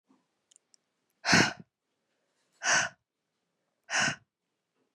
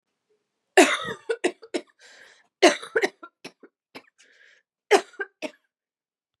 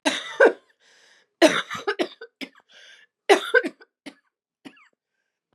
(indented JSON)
{
  "exhalation_length": "4.9 s",
  "exhalation_amplitude": 11425,
  "exhalation_signal_mean_std_ratio": 0.29,
  "cough_length": "6.4 s",
  "cough_amplitude": 26478,
  "cough_signal_mean_std_ratio": 0.26,
  "three_cough_length": "5.5 s",
  "three_cough_amplitude": 27891,
  "three_cough_signal_mean_std_ratio": 0.3,
  "survey_phase": "beta (2021-08-13 to 2022-03-07)",
  "age": "18-44",
  "gender": "Female",
  "wearing_mask": "No",
  "symptom_cough_any": true,
  "symptom_runny_or_blocked_nose": true,
  "symptom_shortness_of_breath": true,
  "smoker_status": "Never smoked",
  "respiratory_condition_asthma": false,
  "respiratory_condition_other": false,
  "recruitment_source": "Test and Trace",
  "submission_delay": "2 days",
  "covid_test_result": "Positive",
  "covid_test_method": "RT-qPCR",
  "covid_ct_value": 13.3,
  "covid_ct_gene": "N gene"
}